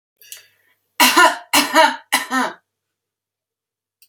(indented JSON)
{
  "three_cough_length": "4.1 s",
  "three_cough_amplitude": 32768,
  "three_cough_signal_mean_std_ratio": 0.39,
  "survey_phase": "beta (2021-08-13 to 2022-03-07)",
  "age": "45-64",
  "gender": "Female",
  "wearing_mask": "No",
  "symptom_none": true,
  "smoker_status": "Ex-smoker",
  "respiratory_condition_asthma": false,
  "respiratory_condition_other": false,
  "recruitment_source": "REACT",
  "submission_delay": "1 day",
  "covid_test_result": "Negative",
  "covid_test_method": "RT-qPCR",
  "influenza_a_test_result": "Unknown/Void",
  "influenza_b_test_result": "Unknown/Void"
}